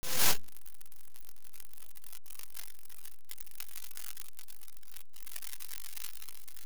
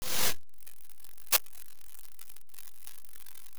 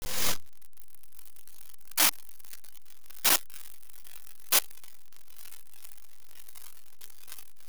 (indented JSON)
{
  "exhalation_length": "6.7 s",
  "exhalation_amplitude": 7344,
  "exhalation_signal_mean_std_ratio": 1.44,
  "cough_length": "3.6 s",
  "cough_amplitude": 16567,
  "cough_signal_mean_std_ratio": 1.21,
  "three_cough_length": "7.7 s",
  "three_cough_amplitude": 20730,
  "three_cough_signal_mean_std_ratio": 1.07,
  "survey_phase": "beta (2021-08-13 to 2022-03-07)",
  "age": "45-64",
  "gender": "Male",
  "wearing_mask": "No",
  "symptom_none": true,
  "smoker_status": "Ex-smoker",
  "respiratory_condition_asthma": false,
  "respiratory_condition_other": false,
  "recruitment_source": "REACT",
  "submission_delay": "1 day",
  "covid_test_result": "Negative",
  "covid_test_method": "RT-qPCR"
}